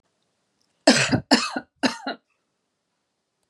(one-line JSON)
{"three_cough_length": "3.5 s", "three_cough_amplitude": 31369, "three_cough_signal_mean_std_ratio": 0.32, "survey_phase": "beta (2021-08-13 to 2022-03-07)", "age": "45-64", "gender": "Female", "wearing_mask": "No", "symptom_none": true, "symptom_onset": "13 days", "smoker_status": "Never smoked", "respiratory_condition_asthma": false, "respiratory_condition_other": false, "recruitment_source": "REACT", "submission_delay": "1 day", "covid_test_result": "Negative", "covid_test_method": "RT-qPCR", "influenza_a_test_result": "Negative", "influenza_b_test_result": "Negative"}